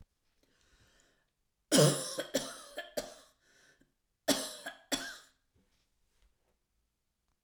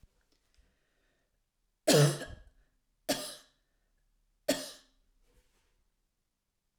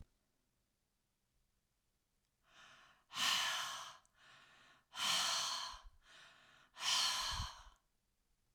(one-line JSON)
{"cough_length": "7.4 s", "cough_amplitude": 7722, "cough_signal_mean_std_ratio": 0.28, "three_cough_length": "6.8 s", "three_cough_amplitude": 9420, "three_cough_signal_mean_std_ratio": 0.23, "exhalation_length": "8.5 s", "exhalation_amplitude": 2533, "exhalation_signal_mean_std_ratio": 0.44, "survey_phase": "alpha (2021-03-01 to 2021-08-12)", "age": "65+", "gender": "Female", "wearing_mask": "No", "symptom_none": true, "smoker_status": "Never smoked", "respiratory_condition_asthma": false, "respiratory_condition_other": false, "recruitment_source": "REACT", "submission_delay": "1 day", "covid_test_result": "Negative", "covid_test_method": "RT-qPCR"}